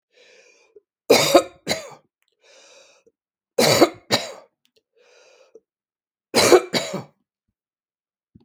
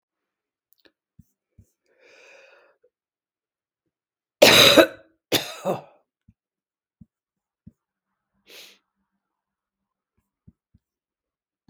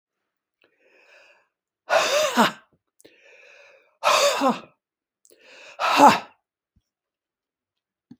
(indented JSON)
{
  "three_cough_length": "8.4 s",
  "three_cough_amplitude": 32766,
  "three_cough_signal_mean_std_ratio": 0.29,
  "cough_length": "11.7 s",
  "cough_amplitude": 32768,
  "cough_signal_mean_std_ratio": 0.18,
  "exhalation_length": "8.2 s",
  "exhalation_amplitude": 32766,
  "exhalation_signal_mean_std_ratio": 0.33,
  "survey_phase": "beta (2021-08-13 to 2022-03-07)",
  "age": "65+",
  "gender": "Female",
  "wearing_mask": "No",
  "symptom_cough_any": true,
  "symptom_runny_or_blocked_nose": true,
  "symptom_fatigue": true,
  "symptom_fever_high_temperature": true,
  "symptom_headache": true,
  "smoker_status": "Ex-smoker",
  "respiratory_condition_asthma": false,
  "respiratory_condition_other": false,
  "recruitment_source": "Test and Trace",
  "submission_delay": "1 day",
  "covid_test_result": "Positive",
  "covid_test_method": "ePCR"
}